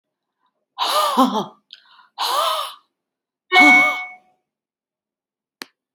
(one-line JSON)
{"exhalation_length": "5.9 s", "exhalation_amplitude": 29184, "exhalation_signal_mean_std_ratio": 0.4, "survey_phase": "alpha (2021-03-01 to 2021-08-12)", "age": "65+", "gender": "Female", "wearing_mask": "No", "symptom_none": true, "smoker_status": "Never smoked", "respiratory_condition_asthma": false, "respiratory_condition_other": false, "recruitment_source": "REACT", "submission_delay": "1 day", "covid_test_result": "Negative", "covid_test_method": "RT-qPCR"}